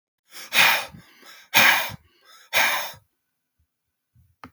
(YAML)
exhalation_length: 4.5 s
exhalation_amplitude: 27289
exhalation_signal_mean_std_ratio: 0.38
survey_phase: beta (2021-08-13 to 2022-03-07)
age: 45-64
gender: Male
wearing_mask: 'No'
symptom_none: true
smoker_status: Never smoked
respiratory_condition_asthma: true
respiratory_condition_other: false
recruitment_source: REACT
submission_delay: 1 day
covid_test_result: Negative
covid_test_method: RT-qPCR
influenza_a_test_result: Negative
influenza_b_test_result: Negative